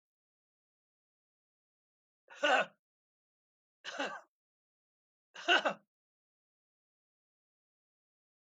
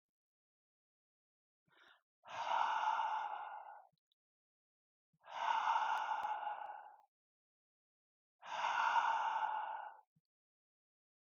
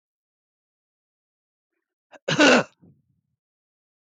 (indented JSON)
{
  "three_cough_length": "8.4 s",
  "three_cough_amplitude": 5882,
  "three_cough_signal_mean_std_ratio": 0.21,
  "exhalation_length": "11.3 s",
  "exhalation_amplitude": 2481,
  "exhalation_signal_mean_std_ratio": 0.51,
  "cough_length": "4.2 s",
  "cough_amplitude": 18756,
  "cough_signal_mean_std_ratio": 0.22,
  "survey_phase": "beta (2021-08-13 to 2022-03-07)",
  "age": "65+",
  "gender": "Male",
  "wearing_mask": "No",
  "symptom_none": true,
  "smoker_status": "Never smoked",
  "respiratory_condition_asthma": false,
  "respiratory_condition_other": false,
  "recruitment_source": "REACT",
  "submission_delay": "4 days",
  "covid_test_result": "Negative",
  "covid_test_method": "RT-qPCR"
}